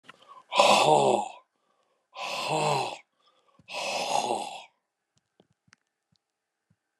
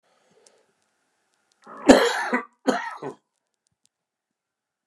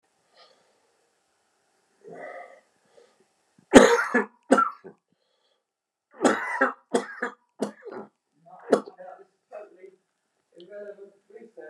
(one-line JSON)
{"exhalation_length": "7.0 s", "exhalation_amplitude": 22148, "exhalation_signal_mean_std_ratio": 0.41, "cough_length": "4.9 s", "cough_amplitude": 29204, "cough_signal_mean_std_ratio": 0.26, "three_cough_length": "11.7 s", "three_cough_amplitude": 29204, "three_cough_signal_mean_std_ratio": 0.25, "survey_phase": "beta (2021-08-13 to 2022-03-07)", "age": "65+", "gender": "Male", "wearing_mask": "No", "symptom_cough_any": true, "symptom_sore_throat": true, "symptom_fatigue": true, "symptom_fever_high_temperature": true, "symptom_onset": "4 days", "smoker_status": "Ex-smoker", "respiratory_condition_asthma": false, "respiratory_condition_other": false, "recruitment_source": "Test and Trace", "submission_delay": "3 days", "covid_test_result": "Positive", "covid_test_method": "ePCR"}